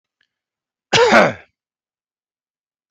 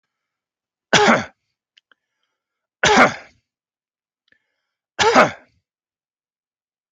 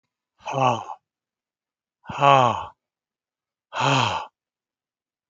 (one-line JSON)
{"cough_length": "2.9 s", "cough_amplitude": 32768, "cough_signal_mean_std_ratio": 0.3, "three_cough_length": "6.9 s", "three_cough_amplitude": 32286, "three_cough_signal_mean_std_ratio": 0.28, "exhalation_length": "5.3 s", "exhalation_amplitude": 26383, "exhalation_signal_mean_std_ratio": 0.35, "survey_phase": "beta (2021-08-13 to 2022-03-07)", "age": "65+", "gender": "Male", "wearing_mask": "No", "symptom_none": true, "symptom_onset": "13 days", "smoker_status": "Never smoked", "respiratory_condition_asthma": false, "respiratory_condition_other": false, "recruitment_source": "REACT", "submission_delay": "5 days", "covid_test_result": "Negative", "covid_test_method": "RT-qPCR"}